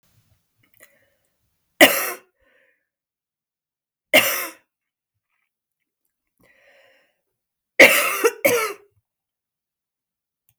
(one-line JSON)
{"three_cough_length": "10.6 s", "three_cough_amplitude": 32768, "three_cough_signal_mean_std_ratio": 0.24, "survey_phase": "beta (2021-08-13 to 2022-03-07)", "age": "45-64", "gender": "Female", "wearing_mask": "No", "symptom_cough_any": true, "symptom_runny_or_blocked_nose": true, "symptom_sore_throat": true, "symptom_abdominal_pain": true, "symptom_fatigue": true, "symptom_fever_high_temperature": true, "symptom_change_to_sense_of_smell_or_taste": true, "smoker_status": "Never smoked", "respiratory_condition_asthma": false, "respiratory_condition_other": false, "recruitment_source": "Test and Trace", "submission_delay": "1 day", "covid_test_result": "Positive", "covid_test_method": "RT-qPCR", "covid_ct_value": 24.3, "covid_ct_gene": "ORF1ab gene"}